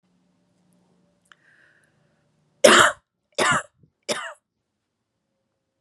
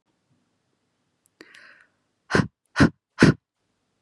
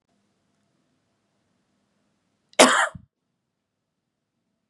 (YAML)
three_cough_length: 5.8 s
three_cough_amplitude: 32624
three_cough_signal_mean_std_ratio: 0.24
exhalation_length: 4.0 s
exhalation_amplitude: 30587
exhalation_signal_mean_std_ratio: 0.23
cough_length: 4.7 s
cough_amplitude: 32767
cough_signal_mean_std_ratio: 0.18
survey_phase: beta (2021-08-13 to 2022-03-07)
age: 18-44
gender: Female
wearing_mask: 'No'
symptom_none: true
smoker_status: Never smoked
respiratory_condition_asthma: false
respiratory_condition_other: false
recruitment_source: REACT
submission_delay: 0 days
covid_test_result: Negative
covid_test_method: RT-qPCR
influenza_a_test_result: Unknown/Void
influenza_b_test_result: Unknown/Void